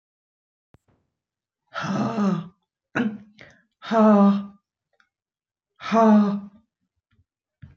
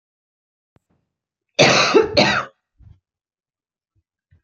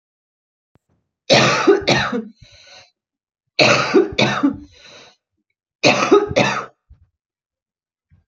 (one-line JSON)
{"exhalation_length": "7.8 s", "exhalation_amplitude": 15849, "exhalation_signal_mean_std_ratio": 0.4, "cough_length": "4.4 s", "cough_amplitude": 29455, "cough_signal_mean_std_ratio": 0.33, "three_cough_length": "8.3 s", "three_cough_amplitude": 32549, "three_cough_signal_mean_std_ratio": 0.43, "survey_phase": "beta (2021-08-13 to 2022-03-07)", "age": "45-64", "gender": "Female", "wearing_mask": "No", "symptom_cough_any": true, "symptom_runny_or_blocked_nose": true, "symptom_shortness_of_breath": true, "symptom_diarrhoea": true, "symptom_fatigue": true, "smoker_status": "Never smoked", "respiratory_condition_asthma": false, "respiratory_condition_other": false, "recruitment_source": "Test and Trace", "submission_delay": "2 days", "covid_test_result": "Positive", "covid_test_method": "RT-qPCR", "covid_ct_value": 22.2, "covid_ct_gene": "ORF1ab gene"}